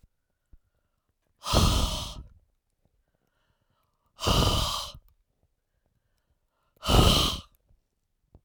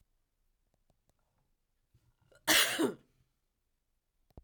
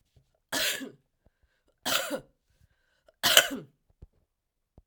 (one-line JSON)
{"exhalation_length": "8.4 s", "exhalation_amplitude": 17601, "exhalation_signal_mean_std_ratio": 0.36, "cough_length": "4.4 s", "cough_amplitude": 7627, "cough_signal_mean_std_ratio": 0.24, "three_cough_length": "4.9 s", "three_cough_amplitude": 32768, "three_cough_signal_mean_std_ratio": 0.29, "survey_phase": "alpha (2021-03-01 to 2021-08-12)", "age": "65+", "gender": "Female", "wearing_mask": "No", "symptom_none": true, "smoker_status": "Ex-smoker", "respiratory_condition_asthma": false, "respiratory_condition_other": false, "recruitment_source": "REACT", "submission_delay": "3 days", "covid_test_result": "Negative", "covid_test_method": "RT-qPCR"}